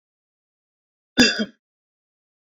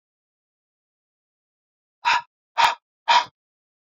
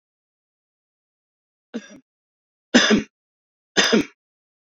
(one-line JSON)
{"cough_length": "2.5 s", "cough_amplitude": 26685, "cough_signal_mean_std_ratio": 0.23, "exhalation_length": "3.8 s", "exhalation_amplitude": 21358, "exhalation_signal_mean_std_ratio": 0.27, "three_cough_length": "4.7 s", "three_cough_amplitude": 27173, "three_cough_signal_mean_std_ratio": 0.27, "survey_phase": "beta (2021-08-13 to 2022-03-07)", "age": "45-64", "gender": "Male", "wearing_mask": "No", "symptom_none": true, "smoker_status": "Never smoked", "respiratory_condition_asthma": false, "respiratory_condition_other": false, "recruitment_source": "REACT", "submission_delay": "1 day", "covid_test_result": "Negative", "covid_test_method": "RT-qPCR"}